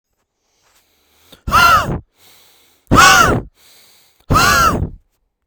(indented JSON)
{
  "exhalation_length": "5.5 s",
  "exhalation_amplitude": 32768,
  "exhalation_signal_mean_std_ratio": 0.45,
  "survey_phase": "beta (2021-08-13 to 2022-03-07)",
  "age": "18-44",
  "gender": "Male",
  "wearing_mask": "No",
  "symptom_none": true,
  "smoker_status": "Never smoked",
  "respiratory_condition_asthma": false,
  "respiratory_condition_other": false,
  "recruitment_source": "REACT",
  "submission_delay": "1 day",
  "covid_test_result": "Negative",
  "covid_test_method": "RT-qPCR",
  "influenza_a_test_result": "Negative",
  "influenza_b_test_result": "Negative"
}